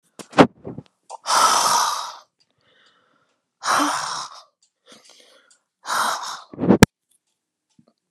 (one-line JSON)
{"exhalation_length": "8.1 s", "exhalation_amplitude": 32768, "exhalation_signal_mean_std_ratio": 0.36, "survey_phase": "alpha (2021-03-01 to 2021-08-12)", "age": "65+", "gender": "Female", "wearing_mask": "No", "symptom_none": true, "smoker_status": "Ex-smoker", "respiratory_condition_asthma": false, "respiratory_condition_other": false, "recruitment_source": "REACT", "submission_delay": "1 day", "covid_test_result": "Negative", "covid_test_method": "RT-qPCR"}